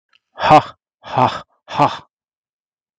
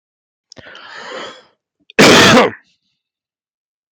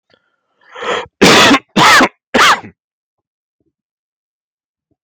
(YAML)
exhalation_length: 3.0 s
exhalation_amplitude: 32768
exhalation_signal_mean_std_ratio: 0.34
cough_length: 3.9 s
cough_amplitude: 32768
cough_signal_mean_std_ratio: 0.36
three_cough_length: 5.0 s
three_cough_amplitude: 32768
three_cough_signal_mean_std_ratio: 0.43
survey_phase: beta (2021-08-13 to 2022-03-07)
age: 18-44
gender: Male
wearing_mask: 'No'
symptom_none: true
smoker_status: Never smoked
respiratory_condition_asthma: false
respiratory_condition_other: false
recruitment_source: REACT
submission_delay: 1 day
covid_test_result: Negative
covid_test_method: RT-qPCR
influenza_a_test_result: Unknown/Void
influenza_b_test_result: Unknown/Void